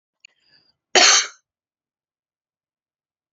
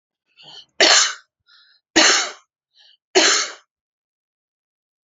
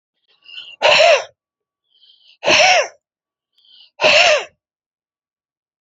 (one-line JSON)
{"cough_length": "3.3 s", "cough_amplitude": 31051, "cough_signal_mean_std_ratio": 0.24, "three_cough_length": "5.0 s", "three_cough_amplitude": 32767, "three_cough_signal_mean_std_ratio": 0.35, "exhalation_length": "5.8 s", "exhalation_amplitude": 31449, "exhalation_signal_mean_std_ratio": 0.39, "survey_phase": "beta (2021-08-13 to 2022-03-07)", "age": "45-64", "gender": "Female", "wearing_mask": "No", "symptom_none": true, "smoker_status": "Never smoked", "respiratory_condition_asthma": false, "respiratory_condition_other": false, "recruitment_source": "REACT", "submission_delay": "1 day", "covid_test_result": "Negative", "covid_test_method": "RT-qPCR"}